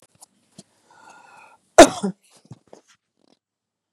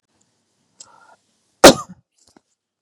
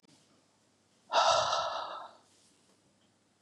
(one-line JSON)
{"cough_length": "3.9 s", "cough_amplitude": 32768, "cough_signal_mean_std_ratio": 0.15, "three_cough_length": "2.8 s", "three_cough_amplitude": 32768, "three_cough_signal_mean_std_ratio": 0.16, "exhalation_length": "3.4 s", "exhalation_amplitude": 6430, "exhalation_signal_mean_std_ratio": 0.39, "survey_phase": "beta (2021-08-13 to 2022-03-07)", "age": "65+", "gender": "Female", "wearing_mask": "No", "symptom_none": true, "smoker_status": "Ex-smoker", "respiratory_condition_asthma": false, "respiratory_condition_other": false, "recruitment_source": "REACT", "submission_delay": "2 days", "covid_test_result": "Negative", "covid_test_method": "RT-qPCR", "influenza_a_test_result": "Negative", "influenza_b_test_result": "Negative"}